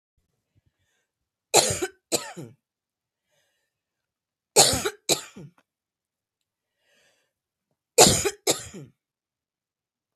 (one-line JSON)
{"three_cough_length": "10.2 s", "three_cough_amplitude": 30475, "three_cough_signal_mean_std_ratio": 0.24, "survey_phase": "beta (2021-08-13 to 2022-03-07)", "age": "45-64", "gender": "Female", "wearing_mask": "No", "symptom_cough_any": true, "symptom_onset": "11 days", "smoker_status": "Ex-smoker", "respiratory_condition_asthma": true, "respiratory_condition_other": false, "recruitment_source": "REACT", "submission_delay": "2 days", "covid_test_result": "Negative", "covid_test_method": "RT-qPCR", "influenza_a_test_result": "Negative", "influenza_b_test_result": "Negative"}